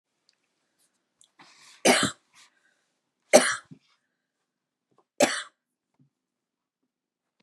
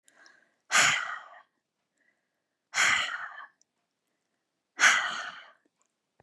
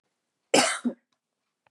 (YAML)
three_cough_length: 7.4 s
three_cough_amplitude: 28303
three_cough_signal_mean_std_ratio: 0.21
exhalation_length: 6.2 s
exhalation_amplitude: 15788
exhalation_signal_mean_std_ratio: 0.35
cough_length: 1.7 s
cough_amplitude: 20252
cough_signal_mean_std_ratio: 0.31
survey_phase: beta (2021-08-13 to 2022-03-07)
age: 18-44
gender: Female
wearing_mask: 'No'
symptom_none: true
smoker_status: Never smoked
respiratory_condition_asthma: true
respiratory_condition_other: false
recruitment_source: REACT
submission_delay: 1 day
covid_test_result: Negative
covid_test_method: RT-qPCR
influenza_a_test_result: Negative
influenza_b_test_result: Negative